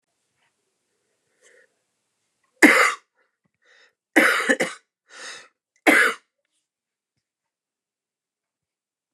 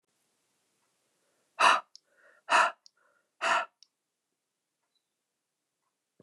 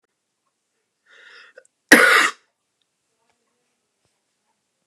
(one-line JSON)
{"three_cough_length": "9.1 s", "three_cough_amplitude": 29204, "three_cough_signal_mean_std_ratio": 0.26, "exhalation_length": "6.2 s", "exhalation_amplitude": 10897, "exhalation_signal_mean_std_ratio": 0.24, "cough_length": "4.9 s", "cough_amplitude": 29204, "cough_signal_mean_std_ratio": 0.22, "survey_phase": "beta (2021-08-13 to 2022-03-07)", "age": "45-64", "gender": "Male", "wearing_mask": "No", "symptom_runny_or_blocked_nose": true, "symptom_fatigue": true, "symptom_headache": true, "symptom_change_to_sense_of_smell_or_taste": true, "symptom_onset": "5 days", "smoker_status": "Never smoked", "respiratory_condition_asthma": false, "respiratory_condition_other": false, "recruitment_source": "Test and Trace", "submission_delay": "2 days", "covid_test_result": "Positive", "covid_test_method": "RT-qPCR", "covid_ct_value": 15.7, "covid_ct_gene": "ORF1ab gene", "covid_ct_mean": 15.9, "covid_viral_load": "5900000 copies/ml", "covid_viral_load_category": "High viral load (>1M copies/ml)"}